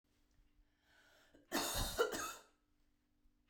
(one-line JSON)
{"cough_length": "3.5 s", "cough_amplitude": 2386, "cough_signal_mean_std_ratio": 0.39, "survey_phase": "beta (2021-08-13 to 2022-03-07)", "age": "18-44", "gender": "Female", "wearing_mask": "No", "symptom_none": true, "smoker_status": "Ex-smoker", "respiratory_condition_asthma": false, "respiratory_condition_other": false, "recruitment_source": "REACT", "submission_delay": "7 days", "covid_test_result": "Negative", "covid_test_method": "RT-qPCR"}